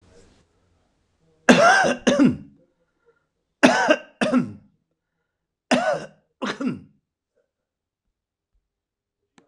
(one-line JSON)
{"three_cough_length": "9.5 s", "three_cough_amplitude": 26028, "three_cough_signal_mean_std_ratio": 0.34, "survey_phase": "beta (2021-08-13 to 2022-03-07)", "age": "65+", "gender": "Male", "wearing_mask": "No", "symptom_none": true, "smoker_status": "Ex-smoker", "respiratory_condition_asthma": false, "respiratory_condition_other": false, "recruitment_source": "REACT", "submission_delay": "8 days", "covid_test_result": "Negative", "covid_test_method": "RT-qPCR", "influenza_a_test_result": "Negative", "influenza_b_test_result": "Negative"}